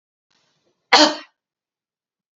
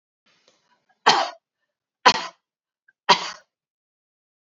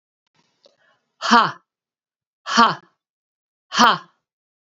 {"cough_length": "2.4 s", "cough_amplitude": 31038, "cough_signal_mean_std_ratio": 0.23, "three_cough_length": "4.4 s", "three_cough_amplitude": 28202, "three_cough_signal_mean_std_ratio": 0.23, "exhalation_length": "4.8 s", "exhalation_amplitude": 29692, "exhalation_signal_mean_std_ratio": 0.28, "survey_phase": "beta (2021-08-13 to 2022-03-07)", "age": "65+", "gender": "Female", "wearing_mask": "No", "symptom_none": true, "smoker_status": "Ex-smoker", "respiratory_condition_asthma": false, "respiratory_condition_other": false, "recruitment_source": "REACT", "submission_delay": "3 days", "covid_test_result": "Negative", "covid_test_method": "RT-qPCR", "influenza_a_test_result": "Negative", "influenza_b_test_result": "Negative"}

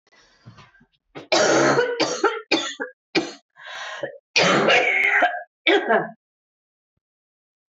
{"cough_length": "7.7 s", "cough_amplitude": 20637, "cough_signal_mean_std_ratio": 0.54, "survey_phase": "beta (2021-08-13 to 2022-03-07)", "age": "45-64", "gender": "Female", "wearing_mask": "No", "symptom_cough_any": true, "symptom_runny_or_blocked_nose": true, "symptom_sore_throat": true, "symptom_headache": true, "symptom_change_to_sense_of_smell_or_taste": true, "symptom_loss_of_taste": true, "symptom_onset": "5 days", "smoker_status": "Never smoked", "respiratory_condition_asthma": true, "respiratory_condition_other": false, "recruitment_source": "Test and Trace", "submission_delay": "2 days", "covid_test_result": "Positive", "covid_test_method": "RT-qPCR", "covid_ct_value": 16.3, "covid_ct_gene": "ORF1ab gene", "covid_ct_mean": 16.8, "covid_viral_load": "3100000 copies/ml", "covid_viral_load_category": "High viral load (>1M copies/ml)"}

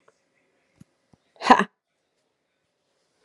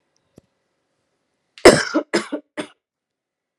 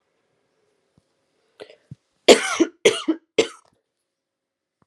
{"exhalation_length": "3.2 s", "exhalation_amplitude": 32767, "exhalation_signal_mean_std_ratio": 0.16, "cough_length": "3.6 s", "cough_amplitude": 32768, "cough_signal_mean_std_ratio": 0.22, "three_cough_length": "4.9 s", "three_cough_amplitude": 32768, "three_cough_signal_mean_std_ratio": 0.23, "survey_phase": "alpha (2021-03-01 to 2021-08-12)", "age": "18-44", "gender": "Female", "wearing_mask": "No", "symptom_cough_any": true, "symptom_onset": "5 days", "smoker_status": "Never smoked", "respiratory_condition_asthma": false, "respiratory_condition_other": false, "recruitment_source": "Test and Trace", "submission_delay": "2 days", "covid_test_result": "Positive", "covid_test_method": "ePCR"}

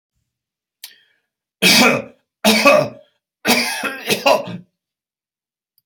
{"three_cough_length": "5.9 s", "three_cough_amplitude": 32768, "three_cough_signal_mean_std_ratio": 0.41, "survey_phase": "alpha (2021-03-01 to 2021-08-12)", "age": "65+", "gender": "Male", "wearing_mask": "No", "symptom_none": true, "smoker_status": "Ex-smoker", "respiratory_condition_asthma": false, "respiratory_condition_other": false, "recruitment_source": "REACT", "submission_delay": "1 day", "covid_test_result": "Negative", "covid_test_method": "RT-qPCR"}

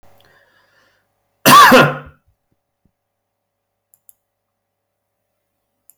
{"cough_length": "6.0 s", "cough_amplitude": 32768, "cough_signal_mean_std_ratio": 0.25, "survey_phase": "beta (2021-08-13 to 2022-03-07)", "age": "18-44", "gender": "Male", "wearing_mask": "No", "symptom_none": true, "smoker_status": "Ex-smoker", "respiratory_condition_asthma": false, "respiratory_condition_other": false, "recruitment_source": "REACT", "submission_delay": "5 days", "covid_test_result": "Negative", "covid_test_method": "RT-qPCR"}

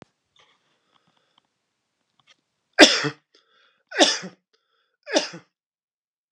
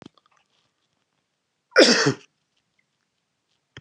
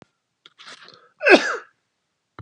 {"three_cough_length": "6.3 s", "three_cough_amplitude": 32768, "three_cough_signal_mean_std_ratio": 0.21, "cough_length": "3.8 s", "cough_amplitude": 29130, "cough_signal_mean_std_ratio": 0.23, "exhalation_length": "2.4 s", "exhalation_amplitude": 32704, "exhalation_signal_mean_std_ratio": 0.25, "survey_phase": "beta (2021-08-13 to 2022-03-07)", "age": "65+", "gender": "Male", "wearing_mask": "No", "symptom_none": true, "smoker_status": "Never smoked", "respiratory_condition_asthma": false, "respiratory_condition_other": false, "recruitment_source": "REACT", "submission_delay": "2 days", "covid_test_result": "Negative", "covid_test_method": "RT-qPCR"}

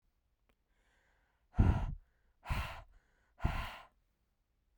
{"exhalation_length": "4.8 s", "exhalation_amplitude": 6116, "exhalation_signal_mean_std_ratio": 0.31, "survey_phase": "beta (2021-08-13 to 2022-03-07)", "age": "18-44", "gender": "Female", "wearing_mask": "No", "symptom_none": true, "smoker_status": "Never smoked", "respiratory_condition_asthma": false, "respiratory_condition_other": false, "recruitment_source": "REACT", "submission_delay": "2 days", "covid_test_result": "Negative", "covid_test_method": "RT-qPCR"}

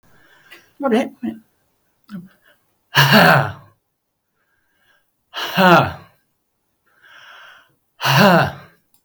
{"exhalation_length": "9.0 s", "exhalation_amplitude": 32768, "exhalation_signal_mean_std_ratio": 0.36, "survey_phase": "beta (2021-08-13 to 2022-03-07)", "age": "65+", "gender": "Male", "wearing_mask": "No", "symptom_none": true, "smoker_status": "Never smoked", "respiratory_condition_asthma": false, "respiratory_condition_other": false, "recruitment_source": "REACT", "submission_delay": "1 day", "covid_test_result": "Negative", "covid_test_method": "RT-qPCR"}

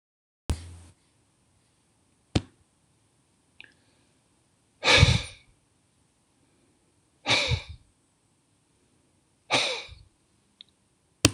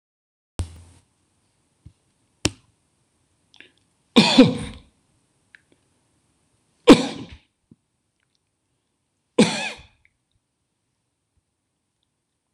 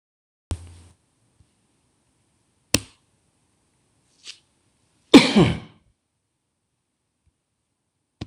{"exhalation_length": "11.3 s", "exhalation_amplitude": 26028, "exhalation_signal_mean_std_ratio": 0.24, "three_cough_length": "12.5 s", "three_cough_amplitude": 26028, "three_cough_signal_mean_std_ratio": 0.19, "cough_length": "8.3 s", "cough_amplitude": 26028, "cough_signal_mean_std_ratio": 0.17, "survey_phase": "beta (2021-08-13 to 2022-03-07)", "age": "65+", "gender": "Male", "wearing_mask": "No", "symptom_none": true, "smoker_status": "Ex-smoker", "respiratory_condition_asthma": false, "respiratory_condition_other": false, "recruitment_source": "REACT", "submission_delay": "1 day", "covid_test_result": "Negative", "covid_test_method": "RT-qPCR"}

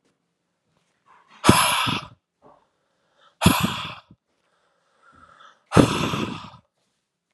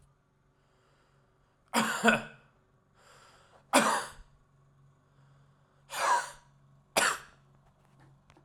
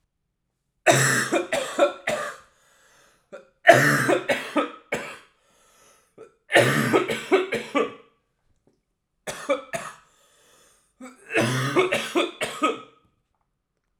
{"exhalation_length": "7.3 s", "exhalation_amplitude": 32768, "exhalation_signal_mean_std_ratio": 0.32, "three_cough_length": "8.4 s", "three_cough_amplitude": 15398, "three_cough_signal_mean_std_ratio": 0.32, "cough_length": "14.0 s", "cough_amplitude": 32768, "cough_signal_mean_std_ratio": 0.44, "survey_phase": "alpha (2021-03-01 to 2021-08-12)", "age": "18-44", "gender": "Male", "wearing_mask": "No", "symptom_cough_any": true, "symptom_headache": true, "symptom_change_to_sense_of_smell_or_taste": true, "symptom_loss_of_taste": true, "symptom_onset": "4 days", "smoker_status": "Ex-smoker", "respiratory_condition_asthma": false, "respiratory_condition_other": false, "recruitment_source": "Test and Trace", "submission_delay": "1 day", "covid_test_result": "Positive", "covid_test_method": "RT-qPCR", "covid_ct_value": 11.5, "covid_ct_gene": "ORF1ab gene", "covid_ct_mean": 12.0, "covid_viral_load": "120000000 copies/ml", "covid_viral_load_category": "High viral load (>1M copies/ml)"}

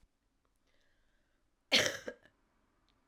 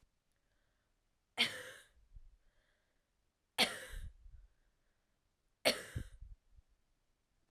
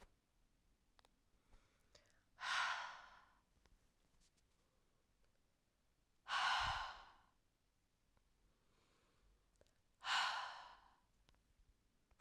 {"cough_length": "3.1 s", "cough_amplitude": 8135, "cough_signal_mean_std_ratio": 0.22, "three_cough_length": "7.5 s", "three_cough_amplitude": 7569, "three_cough_signal_mean_std_ratio": 0.26, "exhalation_length": "12.2 s", "exhalation_amplitude": 1343, "exhalation_signal_mean_std_ratio": 0.33, "survey_phase": "beta (2021-08-13 to 2022-03-07)", "age": "18-44", "gender": "Female", "wearing_mask": "No", "symptom_cough_any": true, "symptom_new_continuous_cough": true, "symptom_runny_or_blocked_nose": true, "symptom_sore_throat": true, "symptom_fatigue": true, "symptom_fever_high_temperature": true, "symptom_change_to_sense_of_smell_or_taste": true, "symptom_loss_of_taste": true, "symptom_other": true, "smoker_status": "Ex-smoker", "respiratory_condition_asthma": false, "respiratory_condition_other": false, "recruitment_source": "Test and Trace", "submission_delay": "2 days", "covid_test_result": "Positive", "covid_test_method": "RT-qPCR", "covid_ct_value": 13.4, "covid_ct_gene": "ORF1ab gene", "covid_ct_mean": 14.2, "covid_viral_load": "22000000 copies/ml", "covid_viral_load_category": "High viral load (>1M copies/ml)"}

